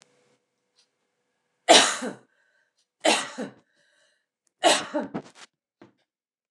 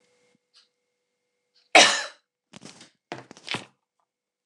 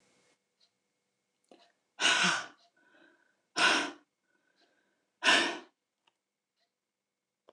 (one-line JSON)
{"three_cough_length": "6.5 s", "three_cough_amplitude": 26537, "three_cough_signal_mean_std_ratio": 0.27, "cough_length": "4.5 s", "cough_amplitude": 29203, "cough_signal_mean_std_ratio": 0.2, "exhalation_length": "7.5 s", "exhalation_amplitude": 10432, "exhalation_signal_mean_std_ratio": 0.3, "survey_phase": "alpha (2021-03-01 to 2021-08-12)", "age": "45-64", "gender": "Female", "wearing_mask": "No", "symptom_shortness_of_breath": true, "symptom_fatigue": true, "smoker_status": "Ex-smoker", "respiratory_condition_asthma": false, "respiratory_condition_other": false, "recruitment_source": "REACT", "submission_delay": "2 days", "covid_test_result": "Negative", "covid_test_method": "RT-qPCR"}